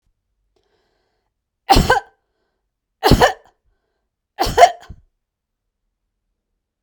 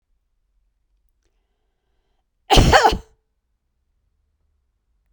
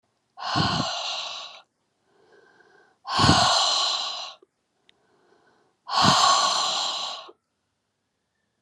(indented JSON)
{
  "three_cough_length": "6.8 s",
  "three_cough_amplitude": 32768,
  "three_cough_signal_mean_std_ratio": 0.26,
  "cough_length": "5.1 s",
  "cough_amplitude": 32768,
  "cough_signal_mean_std_ratio": 0.23,
  "exhalation_length": "8.6 s",
  "exhalation_amplitude": 21370,
  "exhalation_signal_mean_std_ratio": 0.5,
  "survey_phase": "beta (2021-08-13 to 2022-03-07)",
  "age": "65+",
  "gender": "Female",
  "wearing_mask": "No",
  "symptom_none": true,
  "smoker_status": "Never smoked",
  "respiratory_condition_asthma": false,
  "respiratory_condition_other": false,
  "recruitment_source": "REACT",
  "submission_delay": "3 days",
  "covid_test_result": "Negative",
  "covid_test_method": "RT-qPCR"
}